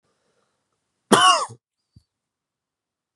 {
  "cough_length": "3.2 s",
  "cough_amplitude": 32705,
  "cough_signal_mean_std_ratio": 0.25,
  "survey_phase": "beta (2021-08-13 to 2022-03-07)",
  "age": "18-44",
  "gender": "Male",
  "wearing_mask": "No",
  "symptom_sore_throat": true,
  "symptom_onset": "3 days",
  "smoker_status": "Current smoker (1 to 10 cigarettes per day)",
  "respiratory_condition_asthma": false,
  "respiratory_condition_other": false,
  "recruitment_source": "Test and Trace",
  "submission_delay": "2 days",
  "covid_test_result": "Positive",
  "covid_test_method": "RT-qPCR",
  "covid_ct_value": 25.0,
  "covid_ct_gene": "N gene"
}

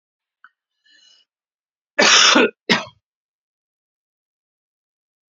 {
  "cough_length": "5.3 s",
  "cough_amplitude": 32768,
  "cough_signal_mean_std_ratio": 0.27,
  "survey_phase": "beta (2021-08-13 to 2022-03-07)",
  "age": "45-64",
  "gender": "Male",
  "wearing_mask": "No",
  "symptom_none": true,
  "smoker_status": "Never smoked",
  "respiratory_condition_asthma": false,
  "respiratory_condition_other": false,
  "recruitment_source": "REACT",
  "submission_delay": "2 days",
  "covid_test_result": "Negative",
  "covid_test_method": "RT-qPCR"
}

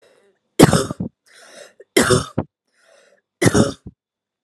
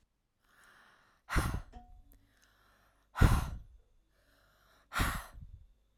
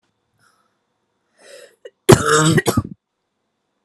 {
  "three_cough_length": "4.4 s",
  "three_cough_amplitude": 32768,
  "three_cough_signal_mean_std_ratio": 0.33,
  "exhalation_length": "6.0 s",
  "exhalation_amplitude": 9382,
  "exhalation_signal_mean_std_ratio": 0.3,
  "cough_length": "3.8 s",
  "cough_amplitude": 32768,
  "cough_signal_mean_std_ratio": 0.3,
  "survey_phase": "alpha (2021-03-01 to 2021-08-12)",
  "age": "18-44",
  "gender": "Female",
  "wearing_mask": "No",
  "symptom_none": true,
  "smoker_status": "Never smoked",
  "respiratory_condition_asthma": true,
  "respiratory_condition_other": false,
  "recruitment_source": "REACT",
  "submission_delay": "1 day",
  "covid_test_result": "Negative",
  "covid_test_method": "RT-qPCR"
}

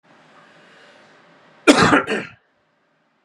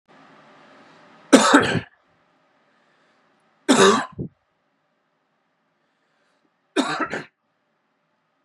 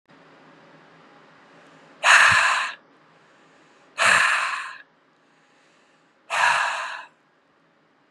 {
  "cough_length": "3.2 s",
  "cough_amplitude": 32767,
  "cough_signal_mean_std_ratio": 0.3,
  "three_cough_length": "8.4 s",
  "three_cough_amplitude": 32768,
  "three_cough_signal_mean_std_ratio": 0.27,
  "exhalation_length": "8.1 s",
  "exhalation_amplitude": 27192,
  "exhalation_signal_mean_std_ratio": 0.39,
  "survey_phase": "beta (2021-08-13 to 2022-03-07)",
  "age": "18-44",
  "gender": "Male",
  "wearing_mask": "No",
  "symptom_none": true,
  "smoker_status": "Never smoked",
  "respiratory_condition_asthma": true,
  "respiratory_condition_other": false,
  "recruitment_source": "Test and Trace",
  "submission_delay": "1 day",
  "covid_test_result": "Positive",
  "covid_test_method": "LFT"
}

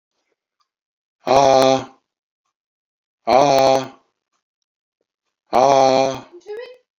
{
  "exhalation_length": "7.0 s",
  "exhalation_amplitude": 29358,
  "exhalation_signal_mean_std_ratio": 0.38,
  "survey_phase": "beta (2021-08-13 to 2022-03-07)",
  "age": "65+",
  "gender": "Male",
  "wearing_mask": "No",
  "symptom_cough_any": true,
  "symptom_runny_or_blocked_nose": true,
  "symptom_onset": "12 days",
  "smoker_status": "Ex-smoker",
  "respiratory_condition_asthma": false,
  "respiratory_condition_other": false,
  "recruitment_source": "REACT",
  "submission_delay": "1 day",
  "covid_test_result": "Negative",
  "covid_test_method": "RT-qPCR"
}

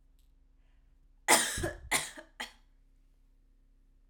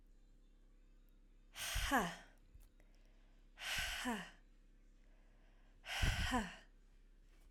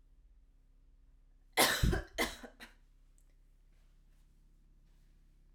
{
  "cough_length": "4.1 s",
  "cough_amplitude": 12039,
  "cough_signal_mean_std_ratio": 0.31,
  "exhalation_length": "7.5 s",
  "exhalation_amplitude": 2418,
  "exhalation_signal_mean_std_ratio": 0.47,
  "three_cough_length": "5.5 s",
  "three_cough_amplitude": 7153,
  "three_cough_signal_mean_std_ratio": 0.3,
  "survey_phase": "alpha (2021-03-01 to 2021-08-12)",
  "age": "18-44",
  "gender": "Female",
  "wearing_mask": "No",
  "symptom_fatigue": true,
  "symptom_change_to_sense_of_smell_or_taste": true,
  "symptom_loss_of_taste": true,
  "symptom_onset": "3 days",
  "smoker_status": "Never smoked",
  "respiratory_condition_asthma": false,
  "respiratory_condition_other": false,
  "recruitment_source": "Test and Trace",
  "submission_delay": "2 days",
  "covid_test_result": "Positive",
  "covid_test_method": "RT-qPCR",
  "covid_ct_value": 23.0,
  "covid_ct_gene": "ORF1ab gene"
}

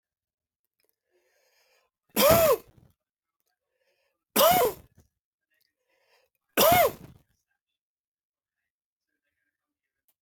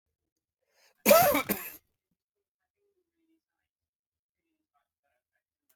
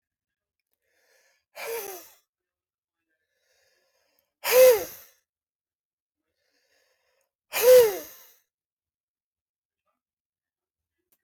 {
  "three_cough_length": "10.2 s",
  "three_cough_amplitude": 14291,
  "three_cough_signal_mean_std_ratio": 0.28,
  "cough_length": "5.8 s",
  "cough_amplitude": 14329,
  "cough_signal_mean_std_ratio": 0.21,
  "exhalation_length": "11.2 s",
  "exhalation_amplitude": 16011,
  "exhalation_signal_mean_std_ratio": 0.22,
  "survey_phase": "beta (2021-08-13 to 2022-03-07)",
  "age": "65+",
  "gender": "Male",
  "wearing_mask": "No",
  "symptom_shortness_of_breath": true,
  "symptom_fatigue": true,
  "symptom_other": true,
  "symptom_onset": "12 days",
  "smoker_status": "Ex-smoker",
  "respiratory_condition_asthma": false,
  "respiratory_condition_other": false,
  "recruitment_source": "REACT",
  "submission_delay": "2 days",
  "covid_test_result": "Negative",
  "covid_test_method": "RT-qPCR",
  "influenza_a_test_result": "Negative",
  "influenza_b_test_result": "Negative"
}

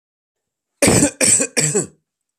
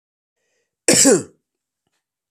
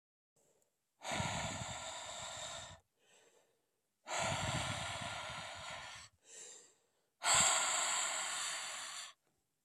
{
  "three_cough_length": "2.4 s",
  "three_cough_amplitude": 32702,
  "three_cough_signal_mean_std_ratio": 0.48,
  "cough_length": "2.3 s",
  "cough_amplitude": 32117,
  "cough_signal_mean_std_ratio": 0.31,
  "exhalation_length": "9.6 s",
  "exhalation_amplitude": 4698,
  "exhalation_signal_mean_std_ratio": 0.58,
  "survey_phase": "beta (2021-08-13 to 2022-03-07)",
  "age": "18-44",
  "gender": "Male",
  "wearing_mask": "No",
  "symptom_cough_any": true,
  "symptom_runny_or_blocked_nose": true,
  "smoker_status": "Never smoked",
  "respiratory_condition_asthma": false,
  "respiratory_condition_other": false,
  "recruitment_source": "Test and Trace",
  "submission_delay": "1 day",
  "covid_test_result": "Positive",
  "covid_test_method": "LFT"
}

